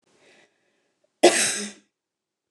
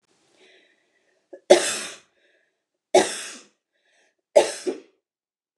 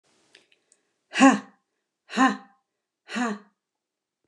{"cough_length": "2.5 s", "cough_amplitude": 26583, "cough_signal_mean_std_ratio": 0.27, "three_cough_length": "5.6 s", "three_cough_amplitude": 29204, "three_cough_signal_mean_std_ratio": 0.25, "exhalation_length": "4.3 s", "exhalation_amplitude": 20666, "exhalation_signal_mean_std_ratio": 0.28, "survey_phase": "beta (2021-08-13 to 2022-03-07)", "age": "45-64", "gender": "Female", "wearing_mask": "No", "symptom_none": true, "smoker_status": "Ex-smoker", "respiratory_condition_asthma": false, "respiratory_condition_other": false, "recruitment_source": "REACT", "submission_delay": "2 days", "covid_test_result": "Negative", "covid_test_method": "RT-qPCR", "influenza_a_test_result": "Negative", "influenza_b_test_result": "Negative"}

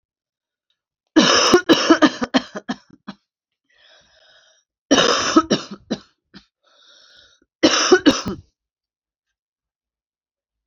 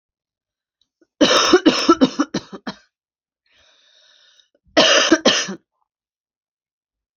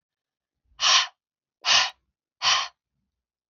{"three_cough_length": "10.7 s", "three_cough_amplitude": 32005, "three_cough_signal_mean_std_ratio": 0.35, "cough_length": "7.2 s", "cough_amplitude": 29759, "cough_signal_mean_std_ratio": 0.36, "exhalation_length": "3.5 s", "exhalation_amplitude": 19168, "exhalation_signal_mean_std_ratio": 0.36, "survey_phase": "alpha (2021-03-01 to 2021-08-12)", "age": "18-44", "gender": "Female", "wearing_mask": "No", "symptom_cough_any": true, "symptom_headache": true, "symptom_onset": "9 days", "smoker_status": "Current smoker (1 to 10 cigarettes per day)", "respiratory_condition_asthma": false, "respiratory_condition_other": false, "recruitment_source": "REACT", "submission_delay": "2 days", "covid_test_result": "Negative", "covid_test_method": "RT-qPCR"}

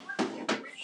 {"three_cough_length": "0.8 s", "three_cough_amplitude": 5521, "three_cough_signal_mean_std_ratio": 0.73, "survey_phase": "beta (2021-08-13 to 2022-03-07)", "age": "65+", "gender": "Female", "wearing_mask": "No", "symptom_none": true, "smoker_status": "Current smoker (11 or more cigarettes per day)", "respiratory_condition_asthma": false, "respiratory_condition_other": false, "recruitment_source": "REACT", "submission_delay": "2 days", "covid_test_result": "Negative", "covid_test_method": "RT-qPCR", "influenza_a_test_result": "Negative", "influenza_b_test_result": "Negative"}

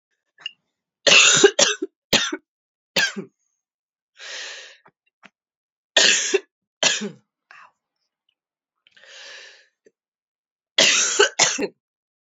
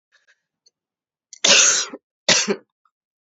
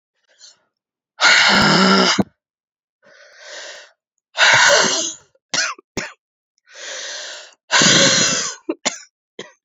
{"three_cough_length": "12.2 s", "three_cough_amplitude": 32767, "three_cough_signal_mean_std_ratio": 0.34, "cough_length": "3.3 s", "cough_amplitude": 31613, "cough_signal_mean_std_ratio": 0.35, "exhalation_length": "9.6 s", "exhalation_amplitude": 31818, "exhalation_signal_mean_std_ratio": 0.48, "survey_phase": "alpha (2021-03-01 to 2021-08-12)", "age": "45-64", "gender": "Female", "wearing_mask": "No", "symptom_cough_any": true, "symptom_new_continuous_cough": true, "symptom_shortness_of_breath": true, "symptom_fatigue": true, "symptom_fever_high_temperature": true, "symptom_headache": true, "symptom_change_to_sense_of_smell_or_taste": true, "symptom_loss_of_taste": true, "smoker_status": "Never smoked", "respiratory_condition_asthma": false, "respiratory_condition_other": false, "recruitment_source": "Test and Trace", "submission_delay": "2 days", "covid_test_result": "Positive", "covid_test_method": "RT-qPCR"}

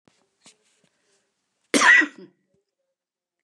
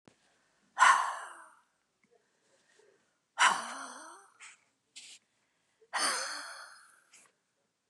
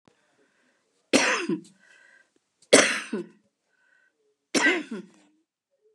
{"cough_length": "3.4 s", "cough_amplitude": 24629, "cough_signal_mean_std_ratio": 0.25, "exhalation_length": "7.9 s", "exhalation_amplitude": 10585, "exhalation_signal_mean_std_ratio": 0.29, "three_cough_length": "5.9 s", "three_cough_amplitude": 29469, "three_cough_signal_mean_std_ratio": 0.31, "survey_phase": "beta (2021-08-13 to 2022-03-07)", "age": "65+", "gender": "Female", "wearing_mask": "No", "symptom_none": true, "smoker_status": "Ex-smoker", "respiratory_condition_asthma": true, "respiratory_condition_other": false, "recruitment_source": "REACT", "submission_delay": "2 days", "covid_test_result": "Negative", "covid_test_method": "RT-qPCR", "influenza_a_test_result": "Negative", "influenza_b_test_result": "Negative"}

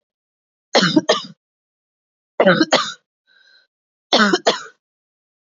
{"three_cough_length": "5.5 s", "three_cough_amplitude": 32767, "three_cough_signal_mean_std_ratio": 0.35, "survey_phase": "beta (2021-08-13 to 2022-03-07)", "age": "45-64", "gender": "Female", "wearing_mask": "No", "symptom_cough_any": true, "symptom_new_continuous_cough": true, "symptom_runny_or_blocked_nose": true, "symptom_shortness_of_breath": true, "symptom_sore_throat": true, "symptom_fatigue": true, "symptom_fever_high_temperature": true, "symptom_headache": true, "symptom_loss_of_taste": true, "symptom_other": true, "symptom_onset": "1 day", "smoker_status": "Never smoked", "respiratory_condition_asthma": false, "respiratory_condition_other": false, "recruitment_source": "Test and Trace", "submission_delay": "1 day", "covid_test_result": "Positive", "covid_test_method": "RT-qPCR", "covid_ct_value": 23.6, "covid_ct_gene": "ORF1ab gene"}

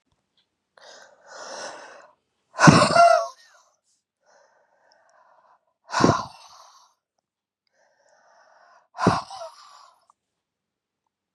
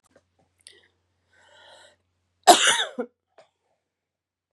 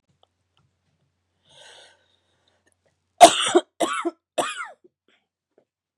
{"exhalation_length": "11.3 s", "exhalation_amplitude": 32768, "exhalation_signal_mean_std_ratio": 0.25, "cough_length": "4.5 s", "cough_amplitude": 32767, "cough_signal_mean_std_ratio": 0.21, "three_cough_length": "6.0 s", "three_cough_amplitude": 32768, "three_cough_signal_mean_std_ratio": 0.21, "survey_phase": "beta (2021-08-13 to 2022-03-07)", "age": "18-44", "gender": "Female", "wearing_mask": "No", "symptom_new_continuous_cough": true, "symptom_runny_or_blocked_nose": true, "symptom_shortness_of_breath": true, "symptom_sore_throat": true, "symptom_fatigue": true, "symptom_fever_high_temperature": true, "symptom_headache": true, "symptom_change_to_sense_of_smell_or_taste": true, "symptom_onset": "3 days", "smoker_status": "Ex-smoker", "respiratory_condition_asthma": true, "respiratory_condition_other": false, "recruitment_source": "Test and Trace", "submission_delay": "1 day", "covid_test_result": "Positive", "covid_test_method": "RT-qPCR", "covid_ct_value": 16.3, "covid_ct_gene": "ORF1ab gene", "covid_ct_mean": 17.2, "covid_viral_load": "2300000 copies/ml", "covid_viral_load_category": "High viral load (>1M copies/ml)"}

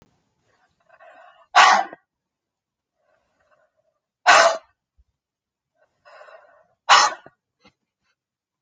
{"exhalation_length": "8.6 s", "exhalation_amplitude": 31752, "exhalation_signal_mean_std_ratio": 0.24, "survey_phase": "alpha (2021-03-01 to 2021-08-12)", "age": "45-64", "gender": "Female", "wearing_mask": "No", "symptom_none": true, "smoker_status": "Never smoked", "respiratory_condition_asthma": false, "respiratory_condition_other": false, "recruitment_source": "REACT", "submission_delay": "2 days", "covid_test_result": "Negative", "covid_test_method": "RT-qPCR"}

